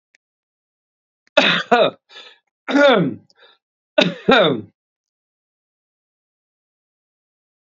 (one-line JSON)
{"three_cough_length": "7.7 s", "three_cough_amplitude": 28920, "three_cough_signal_mean_std_ratio": 0.33, "survey_phase": "beta (2021-08-13 to 2022-03-07)", "age": "45-64", "gender": "Male", "wearing_mask": "No", "symptom_none": true, "smoker_status": "Ex-smoker", "respiratory_condition_asthma": false, "respiratory_condition_other": false, "recruitment_source": "REACT", "submission_delay": "1 day", "covid_test_result": "Negative", "covid_test_method": "RT-qPCR", "influenza_a_test_result": "Negative", "influenza_b_test_result": "Negative"}